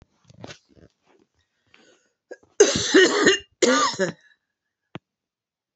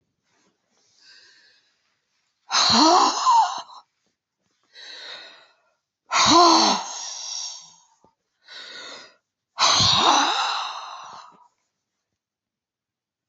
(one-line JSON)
{"cough_length": "5.8 s", "cough_amplitude": 27587, "cough_signal_mean_std_ratio": 0.35, "exhalation_length": "13.3 s", "exhalation_amplitude": 21956, "exhalation_signal_mean_std_ratio": 0.42, "survey_phase": "beta (2021-08-13 to 2022-03-07)", "age": "65+", "gender": "Female", "wearing_mask": "No", "symptom_none": true, "smoker_status": "Never smoked", "respiratory_condition_asthma": false, "respiratory_condition_other": false, "recruitment_source": "REACT", "submission_delay": "3 days", "covid_test_result": "Negative", "covid_test_method": "RT-qPCR", "influenza_a_test_result": "Negative", "influenza_b_test_result": "Negative"}